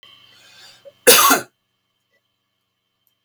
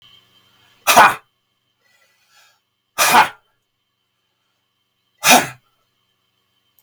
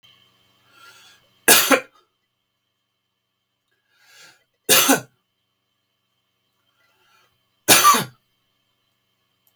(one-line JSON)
{"cough_length": "3.2 s", "cough_amplitude": 32768, "cough_signal_mean_std_ratio": 0.27, "exhalation_length": "6.8 s", "exhalation_amplitude": 32768, "exhalation_signal_mean_std_ratio": 0.26, "three_cough_length": "9.6 s", "three_cough_amplitude": 32768, "three_cough_signal_mean_std_ratio": 0.25, "survey_phase": "beta (2021-08-13 to 2022-03-07)", "age": "65+", "gender": "Male", "wearing_mask": "No", "symptom_none": true, "smoker_status": "Ex-smoker", "respiratory_condition_asthma": false, "respiratory_condition_other": false, "recruitment_source": "REACT", "submission_delay": "4 days", "covid_test_result": "Negative", "covid_test_method": "RT-qPCR", "influenza_a_test_result": "Negative", "influenza_b_test_result": "Negative"}